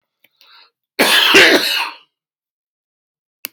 {"cough_length": "3.5 s", "cough_amplitude": 32767, "cough_signal_mean_std_ratio": 0.4, "survey_phase": "beta (2021-08-13 to 2022-03-07)", "age": "45-64", "gender": "Male", "wearing_mask": "No", "symptom_none": true, "smoker_status": "Ex-smoker", "respiratory_condition_asthma": false, "respiratory_condition_other": false, "recruitment_source": "REACT", "submission_delay": "0 days", "covid_test_result": "Negative", "covid_test_method": "RT-qPCR"}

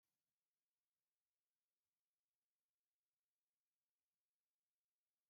{"exhalation_length": "5.3 s", "exhalation_amplitude": 3, "exhalation_signal_mean_std_ratio": 0.28, "survey_phase": "beta (2021-08-13 to 2022-03-07)", "age": "18-44", "gender": "Female", "wearing_mask": "No", "symptom_none": true, "smoker_status": "Never smoked", "respiratory_condition_asthma": false, "respiratory_condition_other": false, "recruitment_source": "REACT", "submission_delay": "2 days", "covid_test_result": "Negative", "covid_test_method": "RT-qPCR", "influenza_a_test_result": "Negative", "influenza_b_test_result": "Negative"}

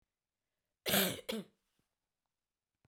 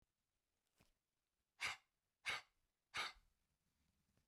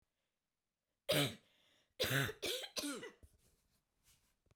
{"cough_length": "2.9 s", "cough_amplitude": 4571, "cough_signal_mean_std_ratio": 0.29, "exhalation_length": "4.3 s", "exhalation_amplitude": 1052, "exhalation_signal_mean_std_ratio": 0.27, "three_cough_length": "4.6 s", "three_cough_amplitude": 2921, "three_cough_signal_mean_std_ratio": 0.38, "survey_phase": "beta (2021-08-13 to 2022-03-07)", "age": "18-44", "gender": "Female", "wearing_mask": "No", "symptom_none": true, "smoker_status": "Never smoked", "respiratory_condition_asthma": true, "respiratory_condition_other": false, "recruitment_source": "REACT", "submission_delay": "2 days", "covid_test_result": "Negative", "covid_test_method": "RT-qPCR", "influenza_a_test_result": "Negative", "influenza_b_test_result": "Negative"}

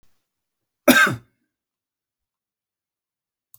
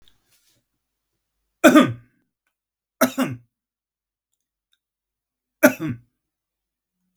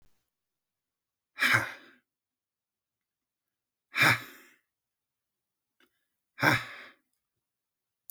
{"cough_length": "3.6 s", "cough_amplitude": 32768, "cough_signal_mean_std_ratio": 0.21, "three_cough_length": "7.2 s", "three_cough_amplitude": 32768, "three_cough_signal_mean_std_ratio": 0.21, "exhalation_length": "8.1 s", "exhalation_amplitude": 14871, "exhalation_signal_mean_std_ratio": 0.24, "survey_phase": "beta (2021-08-13 to 2022-03-07)", "age": "45-64", "gender": "Male", "wearing_mask": "No", "symptom_none": true, "smoker_status": "Never smoked", "respiratory_condition_asthma": false, "respiratory_condition_other": false, "recruitment_source": "REACT", "submission_delay": "3 days", "covid_test_result": "Negative", "covid_test_method": "RT-qPCR", "influenza_a_test_result": "Negative", "influenza_b_test_result": "Negative"}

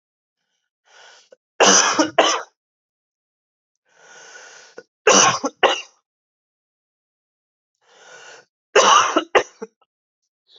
{"three_cough_length": "10.6 s", "three_cough_amplitude": 30251, "three_cough_signal_mean_std_ratio": 0.32, "survey_phase": "beta (2021-08-13 to 2022-03-07)", "age": "18-44", "gender": "Male", "wearing_mask": "No", "symptom_cough_any": true, "symptom_runny_or_blocked_nose": true, "symptom_headache": true, "symptom_change_to_sense_of_smell_or_taste": true, "symptom_loss_of_taste": true, "symptom_onset": "4 days", "smoker_status": "Current smoker (e-cigarettes or vapes only)", "respiratory_condition_asthma": false, "respiratory_condition_other": false, "recruitment_source": "Test and Trace", "submission_delay": "2 days", "covid_test_result": "Positive", "covid_test_method": "RT-qPCR", "covid_ct_value": 17.7, "covid_ct_gene": "ORF1ab gene", "covid_ct_mean": 18.5, "covid_viral_load": "870000 copies/ml", "covid_viral_load_category": "Low viral load (10K-1M copies/ml)"}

